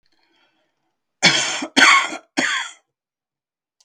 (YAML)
three_cough_length: 3.8 s
three_cough_amplitude: 32768
three_cough_signal_mean_std_ratio: 0.38
survey_phase: beta (2021-08-13 to 2022-03-07)
age: 65+
gender: Male
wearing_mask: 'No'
symptom_none: true
symptom_onset: 6 days
smoker_status: Never smoked
respiratory_condition_asthma: true
respiratory_condition_other: false
recruitment_source: REACT
submission_delay: 3 days
covid_test_result: Negative
covid_test_method: RT-qPCR
influenza_a_test_result: Unknown/Void
influenza_b_test_result: Unknown/Void